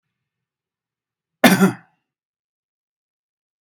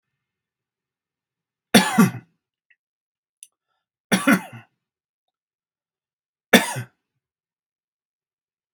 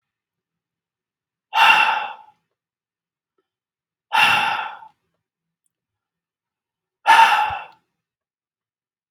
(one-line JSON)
{"cough_length": "3.6 s", "cough_amplitude": 32767, "cough_signal_mean_std_ratio": 0.21, "three_cough_length": "8.7 s", "three_cough_amplitude": 32767, "three_cough_signal_mean_std_ratio": 0.21, "exhalation_length": "9.1 s", "exhalation_amplitude": 32691, "exhalation_signal_mean_std_ratio": 0.32, "survey_phase": "beta (2021-08-13 to 2022-03-07)", "age": "18-44", "gender": "Male", "wearing_mask": "No", "symptom_none": true, "smoker_status": "Ex-smoker", "respiratory_condition_asthma": false, "respiratory_condition_other": false, "recruitment_source": "REACT", "submission_delay": "4 days", "covid_test_result": "Negative", "covid_test_method": "RT-qPCR", "influenza_a_test_result": "Negative", "influenza_b_test_result": "Negative"}